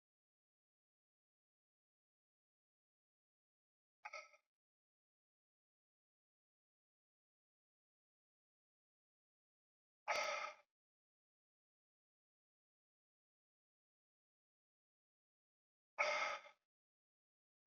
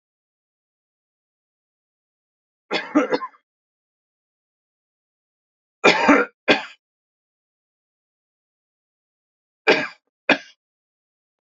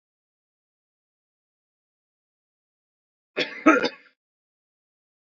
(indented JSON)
{
  "exhalation_length": "17.7 s",
  "exhalation_amplitude": 1894,
  "exhalation_signal_mean_std_ratio": 0.18,
  "three_cough_length": "11.4 s",
  "three_cough_amplitude": 32768,
  "three_cough_signal_mean_std_ratio": 0.23,
  "cough_length": "5.2 s",
  "cough_amplitude": 23923,
  "cough_signal_mean_std_ratio": 0.18,
  "survey_phase": "beta (2021-08-13 to 2022-03-07)",
  "age": "65+",
  "gender": "Male",
  "wearing_mask": "No",
  "symptom_runny_or_blocked_nose": true,
  "symptom_onset": "4 days",
  "smoker_status": "Never smoked",
  "respiratory_condition_asthma": true,
  "respiratory_condition_other": false,
  "recruitment_source": "Test and Trace",
  "submission_delay": "2 days",
  "covid_test_result": "Positive",
  "covid_test_method": "RT-qPCR",
  "covid_ct_value": 17.1,
  "covid_ct_gene": "N gene",
  "covid_ct_mean": 17.2,
  "covid_viral_load": "2300000 copies/ml",
  "covid_viral_load_category": "High viral load (>1M copies/ml)"
}